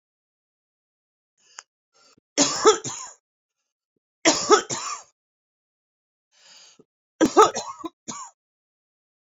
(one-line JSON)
{"three_cough_length": "9.3 s", "three_cough_amplitude": 26471, "three_cough_signal_mean_std_ratio": 0.27, "survey_phase": "beta (2021-08-13 to 2022-03-07)", "age": "45-64", "gender": "Female", "wearing_mask": "No", "symptom_cough_any": true, "symptom_shortness_of_breath": true, "symptom_abdominal_pain": true, "symptom_fatigue": true, "symptom_fever_high_temperature": true, "symptom_headache": true, "symptom_loss_of_taste": true, "symptom_onset": "4 days", "smoker_status": "Ex-smoker", "respiratory_condition_asthma": true, "respiratory_condition_other": false, "recruitment_source": "Test and Trace", "submission_delay": "2 days", "covid_test_result": "Positive", "covid_test_method": "ePCR"}